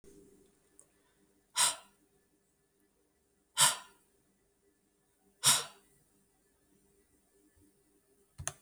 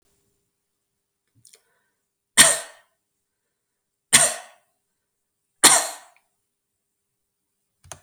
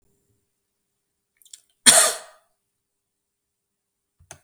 {"exhalation_length": "8.6 s", "exhalation_amplitude": 8881, "exhalation_signal_mean_std_ratio": 0.21, "three_cough_length": "8.0 s", "three_cough_amplitude": 32768, "three_cough_signal_mean_std_ratio": 0.21, "cough_length": "4.4 s", "cough_amplitude": 32768, "cough_signal_mean_std_ratio": 0.19, "survey_phase": "beta (2021-08-13 to 2022-03-07)", "age": "45-64", "gender": "Female", "wearing_mask": "No", "symptom_none": true, "smoker_status": "Never smoked", "respiratory_condition_asthma": false, "respiratory_condition_other": false, "recruitment_source": "REACT", "submission_delay": "1 day", "covid_test_result": "Negative", "covid_test_method": "RT-qPCR"}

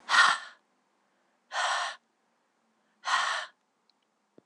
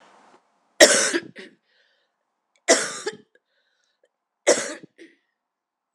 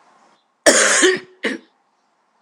{"exhalation_length": "4.5 s", "exhalation_amplitude": 13968, "exhalation_signal_mean_std_ratio": 0.36, "three_cough_length": "5.9 s", "three_cough_amplitude": 26028, "three_cough_signal_mean_std_ratio": 0.26, "cough_length": "2.4 s", "cough_amplitude": 26028, "cough_signal_mean_std_ratio": 0.42, "survey_phase": "alpha (2021-03-01 to 2021-08-12)", "age": "45-64", "gender": "Female", "wearing_mask": "No", "symptom_cough_any": true, "symptom_headache": true, "symptom_change_to_sense_of_smell_or_taste": true, "symptom_loss_of_taste": true, "smoker_status": "Never smoked", "respiratory_condition_asthma": false, "respiratory_condition_other": false, "recruitment_source": "Test and Trace", "submission_delay": "2 days", "covid_test_result": "Positive", "covid_test_method": "RT-qPCR", "covid_ct_value": 17.7, "covid_ct_gene": "ORF1ab gene", "covid_ct_mean": 22.7, "covid_viral_load": "37000 copies/ml", "covid_viral_load_category": "Low viral load (10K-1M copies/ml)"}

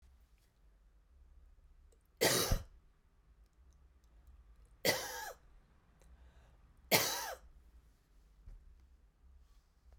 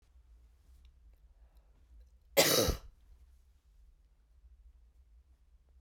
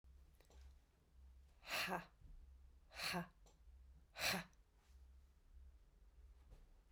{"three_cough_length": "10.0 s", "three_cough_amplitude": 6911, "three_cough_signal_mean_std_ratio": 0.31, "cough_length": "5.8 s", "cough_amplitude": 8491, "cough_signal_mean_std_ratio": 0.26, "exhalation_length": "6.9 s", "exhalation_amplitude": 1220, "exhalation_signal_mean_std_ratio": 0.45, "survey_phase": "beta (2021-08-13 to 2022-03-07)", "age": "45-64", "gender": "Female", "wearing_mask": "No", "symptom_runny_or_blocked_nose": true, "symptom_headache": true, "symptom_onset": "4 days", "smoker_status": "Never smoked", "respiratory_condition_asthma": false, "respiratory_condition_other": false, "recruitment_source": "Test and Trace", "submission_delay": "2 days", "covid_test_result": "Positive", "covid_test_method": "RT-qPCR", "covid_ct_value": 22.2, "covid_ct_gene": "N gene"}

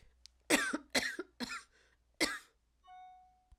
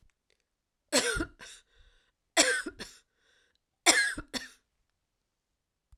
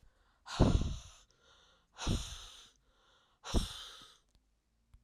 {"cough_length": "3.6 s", "cough_amplitude": 7217, "cough_signal_mean_std_ratio": 0.37, "three_cough_length": "6.0 s", "three_cough_amplitude": 17563, "three_cough_signal_mean_std_ratio": 0.31, "exhalation_length": "5.0 s", "exhalation_amplitude": 8364, "exhalation_signal_mean_std_ratio": 0.33, "survey_phase": "alpha (2021-03-01 to 2021-08-12)", "age": "65+", "gender": "Female", "wearing_mask": "No", "symptom_cough_any": true, "symptom_fatigue": true, "symptom_change_to_sense_of_smell_or_taste": true, "symptom_loss_of_taste": true, "symptom_onset": "5 days", "smoker_status": "Ex-smoker", "respiratory_condition_asthma": false, "respiratory_condition_other": false, "recruitment_source": "Test and Trace", "submission_delay": "1 day", "covid_test_result": "Positive", "covid_test_method": "RT-qPCR", "covid_ct_value": 16.0, "covid_ct_gene": "ORF1ab gene", "covid_ct_mean": 16.4, "covid_viral_load": "4100000 copies/ml", "covid_viral_load_category": "High viral load (>1M copies/ml)"}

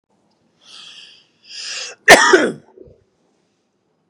{"cough_length": "4.1 s", "cough_amplitude": 32768, "cough_signal_mean_std_ratio": 0.28, "survey_phase": "beta (2021-08-13 to 2022-03-07)", "age": "45-64", "gender": "Male", "wearing_mask": "No", "symptom_none": true, "smoker_status": "Ex-smoker", "respiratory_condition_asthma": true, "respiratory_condition_other": false, "recruitment_source": "REACT", "submission_delay": "2 days", "covid_test_result": "Negative", "covid_test_method": "RT-qPCR", "influenza_a_test_result": "Negative", "influenza_b_test_result": "Negative"}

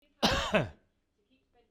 {"cough_length": "1.7 s", "cough_amplitude": 7853, "cough_signal_mean_std_ratio": 0.4, "survey_phase": "beta (2021-08-13 to 2022-03-07)", "age": "45-64", "gender": "Male", "wearing_mask": "No", "symptom_cough_any": true, "smoker_status": "Never smoked", "respiratory_condition_asthma": false, "respiratory_condition_other": false, "recruitment_source": "REACT", "submission_delay": "0 days", "covid_test_result": "Negative", "covid_test_method": "RT-qPCR"}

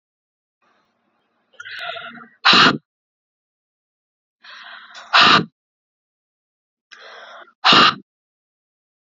{"exhalation_length": "9.0 s", "exhalation_amplitude": 32768, "exhalation_signal_mean_std_ratio": 0.28, "survey_phase": "beta (2021-08-13 to 2022-03-07)", "age": "18-44", "gender": "Female", "wearing_mask": "No", "symptom_runny_or_blocked_nose": true, "symptom_shortness_of_breath": true, "symptom_fatigue": true, "symptom_fever_high_temperature": true, "symptom_headache": true, "symptom_change_to_sense_of_smell_or_taste": true, "symptom_loss_of_taste": true, "smoker_status": "Never smoked", "respiratory_condition_asthma": false, "respiratory_condition_other": true, "recruitment_source": "Test and Trace", "submission_delay": "2 days", "covid_test_result": "Positive", "covid_test_method": "RT-qPCR", "covid_ct_value": 21.0, "covid_ct_gene": "N gene", "covid_ct_mean": 21.5, "covid_viral_load": "86000 copies/ml", "covid_viral_load_category": "Low viral load (10K-1M copies/ml)"}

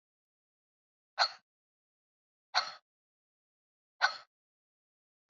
{"exhalation_length": "5.3 s", "exhalation_amplitude": 7158, "exhalation_signal_mean_std_ratio": 0.18, "survey_phase": "alpha (2021-03-01 to 2021-08-12)", "age": "65+", "gender": "Female", "wearing_mask": "No", "symptom_cough_any": true, "symptom_fatigue": true, "symptom_headache": true, "symptom_change_to_sense_of_smell_or_taste": true, "symptom_onset": "3 days", "smoker_status": "Never smoked", "respiratory_condition_asthma": false, "respiratory_condition_other": false, "recruitment_source": "Test and Trace", "submission_delay": "1 day", "covid_test_result": "Positive", "covid_test_method": "RT-qPCR"}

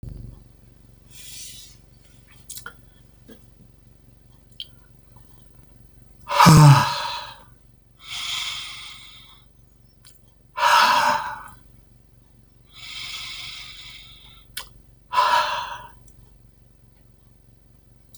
{"exhalation_length": "18.2 s", "exhalation_amplitude": 30850, "exhalation_signal_mean_std_ratio": 0.31, "survey_phase": "beta (2021-08-13 to 2022-03-07)", "age": "65+", "gender": "Male", "wearing_mask": "No", "symptom_none": true, "smoker_status": "Ex-smoker", "respiratory_condition_asthma": false, "respiratory_condition_other": false, "recruitment_source": "REACT", "submission_delay": "1 day", "covid_test_result": "Negative", "covid_test_method": "RT-qPCR", "influenza_a_test_result": "Negative", "influenza_b_test_result": "Negative"}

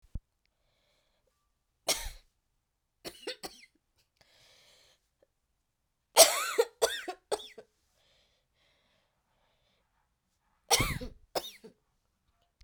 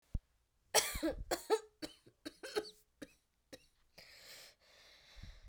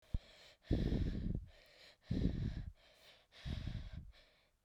{"three_cough_length": "12.6 s", "three_cough_amplitude": 29682, "three_cough_signal_mean_std_ratio": 0.21, "cough_length": "5.5 s", "cough_amplitude": 6046, "cough_signal_mean_std_ratio": 0.33, "exhalation_length": "4.6 s", "exhalation_amplitude": 2453, "exhalation_signal_mean_std_ratio": 0.55, "survey_phase": "beta (2021-08-13 to 2022-03-07)", "age": "18-44", "gender": "Female", "wearing_mask": "No", "symptom_cough_any": true, "symptom_runny_or_blocked_nose": true, "symptom_shortness_of_breath": true, "symptom_headache": true, "symptom_change_to_sense_of_smell_or_taste": true, "symptom_loss_of_taste": true, "symptom_onset": "2 days", "smoker_status": "Never smoked", "respiratory_condition_asthma": false, "respiratory_condition_other": false, "recruitment_source": "Test and Trace", "submission_delay": "1 day", "covid_test_result": "Positive", "covid_test_method": "RT-qPCR"}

